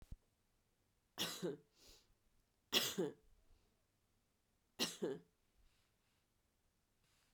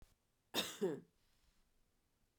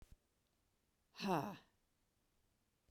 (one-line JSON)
{"three_cough_length": "7.3 s", "three_cough_amplitude": 3664, "three_cough_signal_mean_std_ratio": 0.3, "cough_length": "2.4 s", "cough_amplitude": 2396, "cough_signal_mean_std_ratio": 0.32, "exhalation_length": "2.9 s", "exhalation_amplitude": 1696, "exhalation_signal_mean_std_ratio": 0.27, "survey_phase": "beta (2021-08-13 to 2022-03-07)", "age": "45-64", "gender": "Female", "wearing_mask": "No", "symptom_runny_or_blocked_nose": true, "symptom_sore_throat": true, "symptom_fatigue": true, "symptom_fever_high_temperature": true, "symptom_headache": true, "symptom_onset": "4 days", "smoker_status": "Never smoked", "respiratory_condition_asthma": false, "respiratory_condition_other": false, "recruitment_source": "REACT", "submission_delay": "2 days", "covid_test_result": "Negative", "covid_test_method": "RT-qPCR", "influenza_a_test_result": "Negative", "influenza_b_test_result": "Negative"}